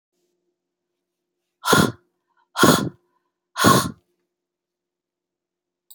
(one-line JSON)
{"exhalation_length": "5.9 s", "exhalation_amplitude": 30462, "exhalation_signal_mean_std_ratio": 0.28, "survey_phase": "beta (2021-08-13 to 2022-03-07)", "age": "45-64", "gender": "Female", "wearing_mask": "No", "symptom_none": true, "smoker_status": "Current smoker (11 or more cigarettes per day)", "respiratory_condition_asthma": false, "respiratory_condition_other": false, "recruitment_source": "REACT", "submission_delay": "1 day", "covid_test_result": "Negative", "covid_test_method": "RT-qPCR", "influenza_a_test_result": "Negative", "influenza_b_test_result": "Negative"}